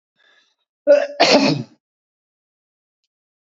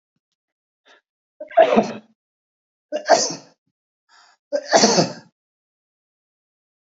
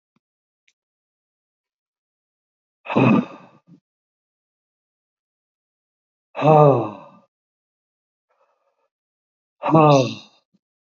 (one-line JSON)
{"cough_length": "3.4 s", "cough_amplitude": 29470, "cough_signal_mean_std_ratio": 0.34, "three_cough_length": "6.9 s", "three_cough_amplitude": 28000, "three_cough_signal_mean_std_ratio": 0.3, "exhalation_length": "10.9 s", "exhalation_amplitude": 26411, "exhalation_signal_mean_std_ratio": 0.26, "survey_phase": "beta (2021-08-13 to 2022-03-07)", "age": "65+", "gender": "Male", "wearing_mask": "No", "symptom_runny_or_blocked_nose": true, "symptom_sore_throat": true, "symptom_onset": "4 days", "smoker_status": "Ex-smoker", "respiratory_condition_asthma": false, "respiratory_condition_other": false, "recruitment_source": "REACT", "submission_delay": "14 days", "covid_test_result": "Negative", "covid_test_method": "RT-qPCR"}